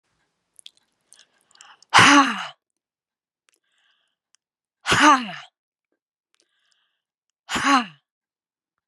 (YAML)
exhalation_length: 8.9 s
exhalation_amplitude: 29984
exhalation_signal_mean_std_ratio: 0.27
survey_phase: beta (2021-08-13 to 2022-03-07)
age: 65+
gender: Female
wearing_mask: 'No'
symptom_none: true
smoker_status: Never smoked
respiratory_condition_asthma: false
respiratory_condition_other: false
recruitment_source: REACT
submission_delay: 6 days
covid_test_result: Negative
covid_test_method: RT-qPCR
influenza_a_test_result: Negative
influenza_b_test_result: Negative